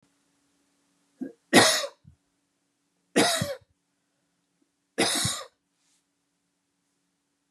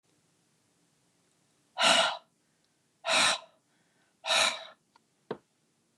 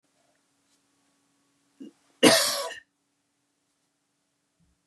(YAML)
three_cough_length: 7.5 s
three_cough_amplitude: 22405
three_cough_signal_mean_std_ratio: 0.28
exhalation_length: 6.0 s
exhalation_amplitude: 9247
exhalation_signal_mean_std_ratio: 0.34
cough_length: 4.9 s
cough_amplitude: 26192
cough_signal_mean_std_ratio: 0.22
survey_phase: beta (2021-08-13 to 2022-03-07)
age: 45-64
gender: Female
wearing_mask: 'No'
symptom_none: true
smoker_status: Ex-smoker
respiratory_condition_asthma: false
respiratory_condition_other: false
recruitment_source: REACT
submission_delay: 6 days
covid_test_result: Negative
covid_test_method: RT-qPCR
influenza_a_test_result: Negative
influenza_b_test_result: Negative